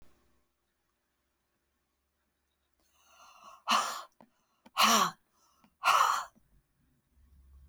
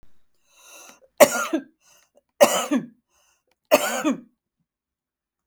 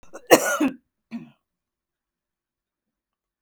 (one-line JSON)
{"exhalation_length": "7.7 s", "exhalation_amplitude": 8807, "exhalation_signal_mean_std_ratio": 0.29, "three_cough_length": "5.5 s", "three_cough_amplitude": 32768, "three_cough_signal_mean_std_ratio": 0.3, "cough_length": "3.4 s", "cough_amplitude": 32768, "cough_signal_mean_std_ratio": 0.24, "survey_phase": "beta (2021-08-13 to 2022-03-07)", "age": "65+", "gender": "Female", "wearing_mask": "No", "symptom_none": true, "smoker_status": "Ex-smoker", "respiratory_condition_asthma": false, "respiratory_condition_other": false, "recruitment_source": "REACT", "submission_delay": "2 days", "covid_test_result": "Negative", "covid_test_method": "RT-qPCR", "influenza_a_test_result": "Negative", "influenza_b_test_result": "Negative"}